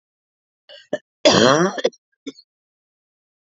{
  "cough_length": "3.5 s",
  "cough_amplitude": 32767,
  "cough_signal_mean_std_ratio": 0.31,
  "survey_phase": "alpha (2021-03-01 to 2021-08-12)",
  "age": "45-64",
  "gender": "Female",
  "wearing_mask": "No",
  "symptom_cough_any": true,
  "symptom_fatigue": true,
  "symptom_fever_high_temperature": true,
  "symptom_onset": "3 days",
  "smoker_status": "Never smoked",
  "respiratory_condition_asthma": false,
  "respiratory_condition_other": false,
  "recruitment_source": "Test and Trace",
  "submission_delay": "2 days",
  "covid_test_result": "Positive",
  "covid_test_method": "RT-qPCR",
  "covid_ct_value": 22.4,
  "covid_ct_gene": "ORF1ab gene",
  "covid_ct_mean": 22.8,
  "covid_viral_load": "34000 copies/ml",
  "covid_viral_load_category": "Low viral load (10K-1M copies/ml)"
}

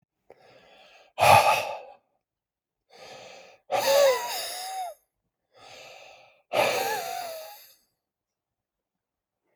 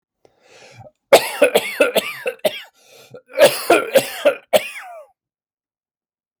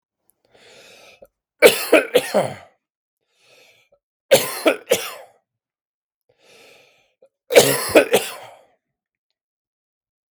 {
  "exhalation_length": "9.6 s",
  "exhalation_amplitude": 20099,
  "exhalation_signal_mean_std_ratio": 0.37,
  "cough_length": "6.4 s",
  "cough_amplitude": 32768,
  "cough_signal_mean_std_ratio": 0.38,
  "three_cough_length": "10.3 s",
  "three_cough_amplitude": 32768,
  "three_cough_signal_mean_std_ratio": 0.29,
  "survey_phase": "beta (2021-08-13 to 2022-03-07)",
  "age": "45-64",
  "gender": "Male",
  "wearing_mask": "No",
  "symptom_cough_any": true,
  "symptom_sore_throat": true,
  "symptom_fatigue": true,
  "smoker_status": "Never smoked",
  "respiratory_condition_asthma": false,
  "respiratory_condition_other": false,
  "recruitment_source": "Test and Trace",
  "submission_delay": "0 days",
  "covid_test_result": "Positive",
  "covid_test_method": "LFT"
}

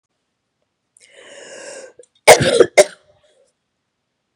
{
  "cough_length": "4.4 s",
  "cough_amplitude": 32768,
  "cough_signal_mean_std_ratio": 0.24,
  "survey_phase": "beta (2021-08-13 to 2022-03-07)",
  "age": "45-64",
  "gender": "Female",
  "wearing_mask": "No",
  "symptom_cough_any": true,
  "symptom_runny_or_blocked_nose": true,
  "symptom_sore_throat": true,
  "symptom_fatigue": true,
  "symptom_headache": true,
  "symptom_change_to_sense_of_smell_or_taste": true,
  "symptom_loss_of_taste": true,
  "symptom_onset": "2 days",
  "smoker_status": "Never smoked",
  "respiratory_condition_asthma": false,
  "respiratory_condition_other": false,
  "recruitment_source": "Test and Trace",
  "submission_delay": "2 days",
  "covid_test_result": "Positive",
  "covid_test_method": "RT-qPCR",
  "covid_ct_value": 26.3,
  "covid_ct_gene": "ORF1ab gene"
}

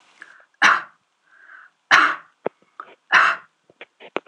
{
  "three_cough_length": "4.3 s",
  "three_cough_amplitude": 26028,
  "three_cough_signal_mean_std_ratio": 0.33,
  "survey_phase": "alpha (2021-03-01 to 2021-08-12)",
  "age": "45-64",
  "gender": "Female",
  "wearing_mask": "No",
  "symptom_fatigue": true,
  "symptom_onset": "12 days",
  "smoker_status": "Ex-smoker",
  "respiratory_condition_asthma": false,
  "respiratory_condition_other": false,
  "recruitment_source": "REACT",
  "submission_delay": "1 day",
  "covid_test_result": "Negative",
  "covid_test_method": "RT-qPCR"
}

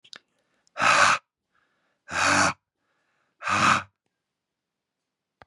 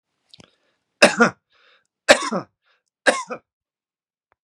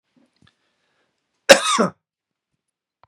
{
  "exhalation_length": "5.5 s",
  "exhalation_amplitude": 19176,
  "exhalation_signal_mean_std_ratio": 0.37,
  "three_cough_length": "4.4 s",
  "three_cough_amplitude": 32768,
  "three_cough_signal_mean_std_ratio": 0.25,
  "cough_length": "3.1 s",
  "cough_amplitude": 32768,
  "cough_signal_mean_std_ratio": 0.21,
  "survey_phase": "beta (2021-08-13 to 2022-03-07)",
  "age": "45-64",
  "gender": "Male",
  "wearing_mask": "No",
  "symptom_none": true,
  "smoker_status": "Never smoked",
  "respiratory_condition_asthma": false,
  "respiratory_condition_other": false,
  "recruitment_source": "REACT",
  "submission_delay": "1 day",
  "covid_test_result": "Negative",
  "covid_test_method": "RT-qPCR",
  "influenza_a_test_result": "Negative",
  "influenza_b_test_result": "Negative"
}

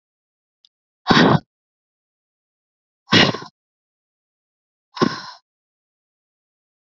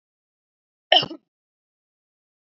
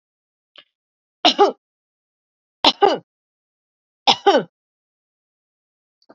{
  "exhalation_length": "6.9 s",
  "exhalation_amplitude": 32768,
  "exhalation_signal_mean_std_ratio": 0.24,
  "cough_length": "2.5 s",
  "cough_amplitude": 29769,
  "cough_signal_mean_std_ratio": 0.17,
  "three_cough_length": "6.1 s",
  "three_cough_amplitude": 29631,
  "three_cough_signal_mean_std_ratio": 0.25,
  "survey_phase": "beta (2021-08-13 to 2022-03-07)",
  "age": "45-64",
  "gender": "Female",
  "wearing_mask": "Yes",
  "symptom_cough_any": true,
  "symptom_runny_or_blocked_nose": true,
  "symptom_shortness_of_breath": true,
  "symptom_sore_throat": true,
  "symptom_fatigue": true,
  "symptom_headache": true,
  "symptom_onset": "2 days",
  "smoker_status": "Never smoked",
  "respiratory_condition_asthma": false,
  "respiratory_condition_other": false,
  "recruitment_source": "Test and Trace",
  "submission_delay": "1 day",
  "covid_test_result": "Negative",
  "covid_test_method": "ePCR"
}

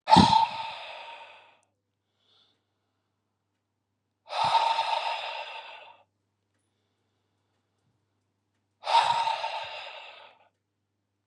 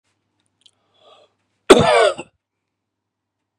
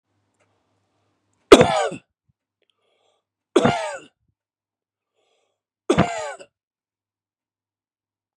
{
  "exhalation_length": "11.3 s",
  "exhalation_amplitude": 19425,
  "exhalation_signal_mean_std_ratio": 0.34,
  "cough_length": "3.6 s",
  "cough_amplitude": 32768,
  "cough_signal_mean_std_ratio": 0.26,
  "three_cough_length": "8.4 s",
  "three_cough_amplitude": 32768,
  "three_cough_signal_mean_std_ratio": 0.22,
  "survey_phase": "beta (2021-08-13 to 2022-03-07)",
  "age": "45-64",
  "gender": "Male",
  "wearing_mask": "No",
  "symptom_none": true,
  "smoker_status": "Never smoked",
  "respiratory_condition_asthma": false,
  "respiratory_condition_other": false,
  "recruitment_source": "REACT",
  "submission_delay": "2 days",
  "covid_test_result": "Negative",
  "covid_test_method": "RT-qPCR",
  "influenza_a_test_result": "Unknown/Void",
  "influenza_b_test_result": "Unknown/Void"
}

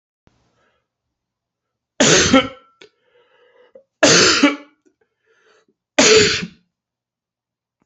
{
  "three_cough_length": "7.9 s",
  "three_cough_amplitude": 32528,
  "three_cough_signal_mean_std_ratio": 0.35,
  "survey_phase": "beta (2021-08-13 to 2022-03-07)",
  "age": "45-64",
  "gender": "Male",
  "wearing_mask": "No",
  "symptom_cough_any": true,
  "symptom_runny_or_blocked_nose": true,
  "symptom_sore_throat": true,
  "symptom_fatigue": true,
  "smoker_status": "Never smoked",
  "respiratory_condition_asthma": false,
  "respiratory_condition_other": false,
  "recruitment_source": "Test and Trace",
  "submission_delay": "2 days",
  "covid_test_result": "Positive",
  "covid_test_method": "ePCR"
}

